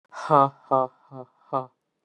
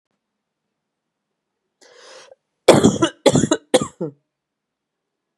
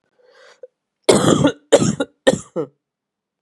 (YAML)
exhalation_length: 2.0 s
exhalation_amplitude: 21252
exhalation_signal_mean_std_ratio: 0.33
cough_length: 5.4 s
cough_amplitude: 32768
cough_signal_mean_std_ratio: 0.27
three_cough_length: 3.4 s
three_cough_amplitude: 32768
three_cough_signal_mean_std_ratio: 0.38
survey_phase: beta (2021-08-13 to 2022-03-07)
age: 18-44
gender: Male
wearing_mask: 'No'
symptom_cough_any: true
symptom_runny_or_blocked_nose: true
symptom_sore_throat: true
symptom_onset: 3 days
smoker_status: Never smoked
respiratory_condition_asthma: false
respiratory_condition_other: false
recruitment_source: Test and Trace
submission_delay: 1 day
covid_test_result: Positive
covid_test_method: RT-qPCR
covid_ct_value: 26.8
covid_ct_gene: N gene
covid_ct_mean: 26.8
covid_viral_load: 1600 copies/ml
covid_viral_load_category: Minimal viral load (< 10K copies/ml)